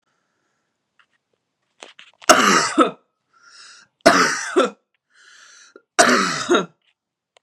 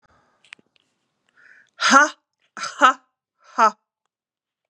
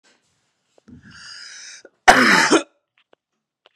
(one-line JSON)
{"three_cough_length": "7.4 s", "three_cough_amplitude": 32768, "three_cough_signal_mean_std_ratio": 0.37, "exhalation_length": "4.7 s", "exhalation_amplitude": 32331, "exhalation_signal_mean_std_ratio": 0.27, "cough_length": "3.8 s", "cough_amplitude": 32768, "cough_signal_mean_std_ratio": 0.31, "survey_phase": "beta (2021-08-13 to 2022-03-07)", "age": "45-64", "gender": "Female", "wearing_mask": "No", "symptom_runny_or_blocked_nose": true, "symptom_onset": "4 days", "smoker_status": "Never smoked", "respiratory_condition_asthma": false, "respiratory_condition_other": false, "recruitment_source": "REACT", "submission_delay": "1 day", "covid_test_result": "Negative", "covid_test_method": "RT-qPCR", "influenza_a_test_result": "Unknown/Void", "influenza_b_test_result": "Unknown/Void"}